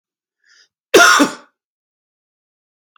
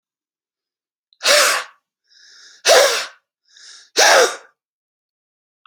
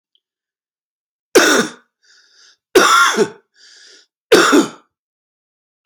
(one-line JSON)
{"cough_length": "3.0 s", "cough_amplitude": 31954, "cough_signal_mean_std_ratio": 0.29, "exhalation_length": "5.7 s", "exhalation_amplitude": 32768, "exhalation_signal_mean_std_ratio": 0.36, "three_cough_length": "5.9 s", "three_cough_amplitude": 31969, "three_cough_signal_mean_std_ratio": 0.37, "survey_phase": "beta (2021-08-13 to 2022-03-07)", "age": "45-64", "gender": "Male", "wearing_mask": "No", "symptom_new_continuous_cough": true, "symptom_shortness_of_breath": true, "symptom_sore_throat": true, "symptom_fatigue": true, "symptom_onset": "3 days", "smoker_status": "Ex-smoker", "respiratory_condition_asthma": false, "respiratory_condition_other": false, "recruitment_source": "Test and Trace", "submission_delay": "1 day", "covid_test_result": "Positive", "covid_test_method": "RT-qPCR", "covid_ct_value": 34.6, "covid_ct_gene": "ORF1ab gene"}